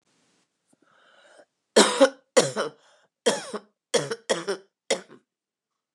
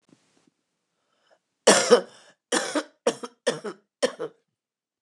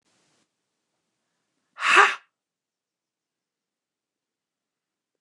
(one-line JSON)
{"three_cough_length": "5.9 s", "three_cough_amplitude": 25726, "three_cough_signal_mean_std_ratio": 0.31, "cough_length": "5.0 s", "cough_amplitude": 28340, "cough_signal_mean_std_ratio": 0.3, "exhalation_length": "5.2 s", "exhalation_amplitude": 26137, "exhalation_signal_mean_std_ratio": 0.18, "survey_phase": "beta (2021-08-13 to 2022-03-07)", "age": "65+", "gender": "Female", "wearing_mask": "No", "symptom_cough_any": true, "symptom_runny_or_blocked_nose": true, "symptom_sore_throat": true, "symptom_onset": "2 days", "smoker_status": "Ex-smoker", "respiratory_condition_asthma": false, "respiratory_condition_other": false, "recruitment_source": "REACT", "submission_delay": "2 days", "covid_test_result": "Positive", "covid_test_method": "RT-qPCR", "covid_ct_value": 26.5, "covid_ct_gene": "E gene", "influenza_a_test_result": "Negative", "influenza_b_test_result": "Negative"}